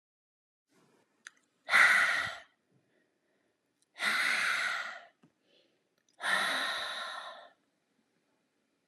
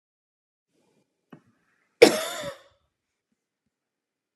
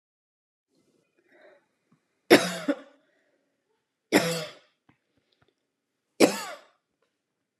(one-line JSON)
{"exhalation_length": "8.9 s", "exhalation_amplitude": 10625, "exhalation_signal_mean_std_ratio": 0.4, "cough_length": "4.4 s", "cough_amplitude": 32584, "cough_signal_mean_std_ratio": 0.15, "three_cough_length": "7.6 s", "three_cough_amplitude": 29410, "three_cough_signal_mean_std_ratio": 0.21, "survey_phase": "beta (2021-08-13 to 2022-03-07)", "age": "18-44", "gender": "Female", "wearing_mask": "No", "symptom_none": true, "smoker_status": "Never smoked", "respiratory_condition_asthma": false, "respiratory_condition_other": false, "recruitment_source": "REACT", "submission_delay": "2 days", "covid_test_result": "Negative", "covid_test_method": "RT-qPCR"}